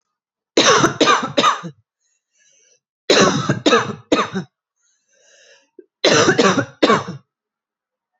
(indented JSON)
{
  "three_cough_length": "8.2 s",
  "three_cough_amplitude": 32767,
  "three_cough_signal_mean_std_ratio": 0.46,
  "survey_phase": "beta (2021-08-13 to 2022-03-07)",
  "age": "18-44",
  "gender": "Female",
  "wearing_mask": "No",
  "symptom_runny_or_blocked_nose": true,
  "symptom_fever_high_temperature": true,
  "symptom_headache": true,
  "smoker_status": "Current smoker (1 to 10 cigarettes per day)",
  "respiratory_condition_asthma": false,
  "respiratory_condition_other": false,
  "recruitment_source": "Test and Trace",
  "submission_delay": "2 days",
  "covid_test_result": "Positive",
  "covid_test_method": "ePCR"
}